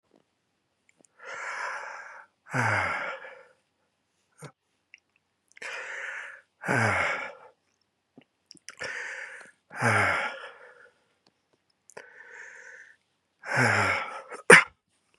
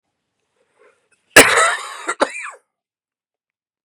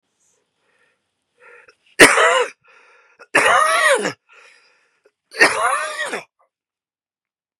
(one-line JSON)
{"exhalation_length": "15.2 s", "exhalation_amplitude": 32097, "exhalation_signal_mean_std_ratio": 0.34, "cough_length": "3.8 s", "cough_amplitude": 32768, "cough_signal_mean_std_ratio": 0.28, "three_cough_length": "7.6 s", "three_cough_amplitude": 32768, "three_cough_signal_mean_std_ratio": 0.38, "survey_phase": "beta (2021-08-13 to 2022-03-07)", "age": "45-64", "gender": "Male", "wearing_mask": "No", "symptom_cough_any": true, "symptom_new_continuous_cough": true, "symptom_runny_or_blocked_nose": true, "symptom_shortness_of_breath": true, "symptom_sore_throat": true, "symptom_fatigue": true, "symptom_headache": true, "symptom_change_to_sense_of_smell_or_taste": true, "symptom_loss_of_taste": true, "symptom_onset": "3 days", "smoker_status": "Never smoked", "respiratory_condition_asthma": false, "respiratory_condition_other": false, "recruitment_source": "Test and Trace", "submission_delay": "2 days", "covid_test_result": "Positive", "covid_test_method": "RT-qPCR"}